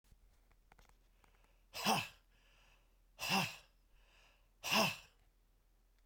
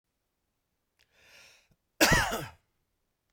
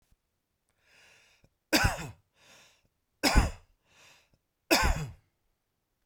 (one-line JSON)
{"exhalation_length": "6.1 s", "exhalation_amplitude": 3670, "exhalation_signal_mean_std_ratio": 0.33, "cough_length": "3.3 s", "cough_amplitude": 12289, "cough_signal_mean_std_ratio": 0.27, "three_cough_length": "6.1 s", "three_cough_amplitude": 16161, "three_cough_signal_mean_std_ratio": 0.3, "survey_phase": "beta (2021-08-13 to 2022-03-07)", "age": "45-64", "gender": "Male", "wearing_mask": "No", "symptom_cough_any": true, "symptom_runny_or_blocked_nose": true, "symptom_onset": "12 days", "smoker_status": "Never smoked", "respiratory_condition_asthma": true, "respiratory_condition_other": false, "recruitment_source": "REACT", "submission_delay": "1 day", "covid_test_result": "Negative", "covid_test_method": "RT-qPCR"}